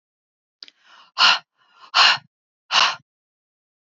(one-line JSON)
{"exhalation_length": "3.9 s", "exhalation_amplitude": 27644, "exhalation_signal_mean_std_ratio": 0.32, "survey_phase": "beta (2021-08-13 to 2022-03-07)", "age": "45-64", "gender": "Female", "wearing_mask": "No", "symptom_none": true, "smoker_status": "Ex-smoker", "respiratory_condition_asthma": false, "respiratory_condition_other": false, "recruitment_source": "REACT", "submission_delay": "2 days", "covid_test_result": "Negative", "covid_test_method": "RT-qPCR", "influenza_a_test_result": "Negative", "influenza_b_test_result": "Negative"}